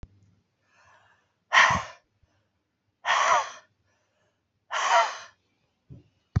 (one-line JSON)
{"exhalation_length": "6.4 s", "exhalation_amplitude": 17515, "exhalation_signal_mean_std_ratio": 0.34, "survey_phase": "beta (2021-08-13 to 2022-03-07)", "age": "45-64", "gender": "Female", "wearing_mask": "No", "symptom_cough_any": true, "symptom_runny_or_blocked_nose": true, "symptom_shortness_of_breath": true, "symptom_abdominal_pain": true, "symptom_fever_high_temperature": true, "symptom_change_to_sense_of_smell_or_taste": true, "symptom_onset": "3 days", "smoker_status": "Current smoker (1 to 10 cigarettes per day)", "respiratory_condition_asthma": false, "respiratory_condition_other": false, "recruitment_source": "Test and Trace", "submission_delay": "2 days", "covid_test_result": "Positive", "covid_test_method": "RT-qPCR", "covid_ct_value": 25.3, "covid_ct_gene": "ORF1ab gene"}